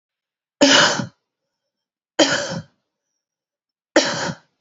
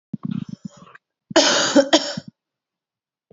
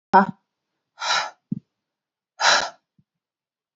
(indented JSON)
{
  "three_cough_length": "4.6 s",
  "three_cough_amplitude": 32768,
  "three_cough_signal_mean_std_ratio": 0.36,
  "cough_length": "3.3 s",
  "cough_amplitude": 29988,
  "cough_signal_mean_std_ratio": 0.38,
  "exhalation_length": "3.8 s",
  "exhalation_amplitude": 26414,
  "exhalation_signal_mean_std_ratio": 0.3,
  "survey_phase": "beta (2021-08-13 to 2022-03-07)",
  "age": "18-44",
  "gender": "Female",
  "wearing_mask": "No",
  "symptom_cough_any": true,
  "symptom_sore_throat": true,
  "symptom_headache": true,
  "smoker_status": "Ex-smoker",
  "respiratory_condition_asthma": false,
  "respiratory_condition_other": false,
  "recruitment_source": "Test and Trace",
  "submission_delay": "1 day",
  "covid_test_result": "Positive",
  "covid_test_method": "LFT"
}